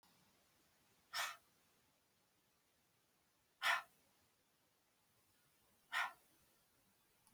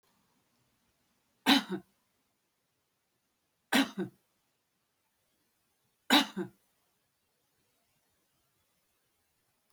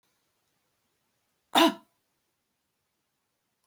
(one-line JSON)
{"exhalation_length": "7.3 s", "exhalation_amplitude": 1872, "exhalation_signal_mean_std_ratio": 0.24, "three_cough_length": "9.7 s", "three_cough_amplitude": 9133, "three_cough_signal_mean_std_ratio": 0.2, "cough_length": "3.7 s", "cough_amplitude": 14407, "cough_signal_mean_std_ratio": 0.17, "survey_phase": "beta (2021-08-13 to 2022-03-07)", "age": "45-64", "gender": "Female", "wearing_mask": "No", "symptom_none": true, "smoker_status": "Current smoker (1 to 10 cigarettes per day)", "respiratory_condition_asthma": false, "respiratory_condition_other": false, "recruitment_source": "REACT", "submission_delay": "1 day", "covid_test_result": "Negative", "covid_test_method": "RT-qPCR"}